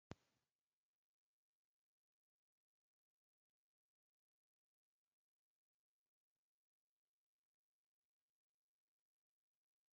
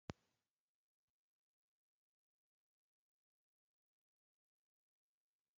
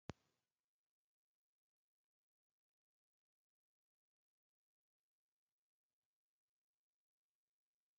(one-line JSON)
{"three_cough_length": "9.9 s", "three_cough_amplitude": 509, "three_cough_signal_mean_std_ratio": 0.04, "cough_length": "5.6 s", "cough_amplitude": 1033, "cough_signal_mean_std_ratio": 0.04, "exhalation_length": "8.0 s", "exhalation_amplitude": 870, "exhalation_signal_mean_std_ratio": 0.04, "survey_phase": "alpha (2021-03-01 to 2021-08-12)", "age": "45-64", "gender": "Male", "wearing_mask": "No", "symptom_none": true, "smoker_status": "Ex-smoker", "respiratory_condition_asthma": false, "respiratory_condition_other": false, "recruitment_source": "REACT", "submission_delay": "1 day", "covid_test_result": "Negative", "covid_test_method": "RT-qPCR"}